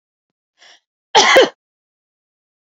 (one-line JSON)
{"cough_length": "2.6 s", "cough_amplitude": 29151, "cough_signal_mean_std_ratio": 0.29, "survey_phase": "beta (2021-08-13 to 2022-03-07)", "age": "45-64", "gender": "Female", "wearing_mask": "No", "symptom_none": true, "smoker_status": "Never smoked", "respiratory_condition_asthma": false, "respiratory_condition_other": false, "recruitment_source": "REACT", "submission_delay": "1 day", "covid_test_result": "Negative", "covid_test_method": "RT-qPCR", "influenza_a_test_result": "Negative", "influenza_b_test_result": "Negative"}